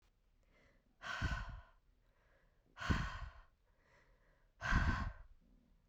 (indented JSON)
{
  "exhalation_length": "5.9 s",
  "exhalation_amplitude": 3007,
  "exhalation_signal_mean_std_ratio": 0.4,
  "survey_phase": "beta (2021-08-13 to 2022-03-07)",
  "age": "18-44",
  "gender": "Female",
  "wearing_mask": "No",
  "symptom_cough_any": true,
  "symptom_fatigue": true,
  "symptom_other": true,
  "symptom_onset": "7 days",
  "smoker_status": "Never smoked",
  "respiratory_condition_asthma": false,
  "respiratory_condition_other": false,
  "recruitment_source": "Test and Trace",
  "submission_delay": "1 day",
  "covid_test_result": "Negative",
  "covid_test_method": "RT-qPCR"
}